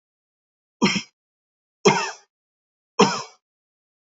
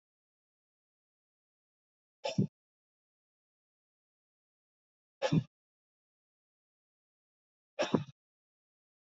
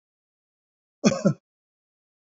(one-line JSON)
{"three_cough_length": "4.2 s", "three_cough_amplitude": 26214, "three_cough_signal_mean_std_ratio": 0.28, "exhalation_length": "9.0 s", "exhalation_amplitude": 7878, "exhalation_signal_mean_std_ratio": 0.18, "cough_length": "2.3 s", "cough_amplitude": 23294, "cough_signal_mean_std_ratio": 0.23, "survey_phase": "beta (2021-08-13 to 2022-03-07)", "age": "45-64", "gender": "Male", "wearing_mask": "No", "symptom_none": true, "smoker_status": "Never smoked", "respiratory_condition_asthma": false, "respiratory_condition_other": false, "recruitment_source": "REACT", "submission_delay": "1 day", "covid_test_result": "Negative", "covid_test_method": "RT-qPCR"}